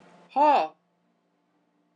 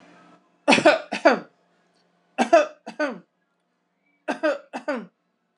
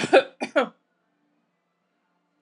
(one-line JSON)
{"exhalation_length": "2.0 s", "exhalation_amplitude": 9578, "exhalation_signal_mean_std_ratio": 0.35, "three_cough_length": "5.6 s", "three_cough_amplitude": 25731, "three_cough_signal_mean_std_ratio": 0.33, "cough_length": "2.4 s", "cough_amplitude": 22394, "cough_signal_mean_std_ratio": 0.25, "survey_phase": "beta (2021-08-13 to 2022-03-07)", "age": "45-64", "gender": "Female", "wearing_mask": "No", "symptom_none": true, "smoker_status": "Never smoked", "respiratory_condition_asthma": false, "respiratory_condition_other": false, "recruitment_source": "REACT", "submission_delay": "2 days", "covid_test_result": "Negative", "covid_test_method": "RT-qPCR", "influenza_a_test_result": "Negative", "influenza_b_test_result": "Negative"}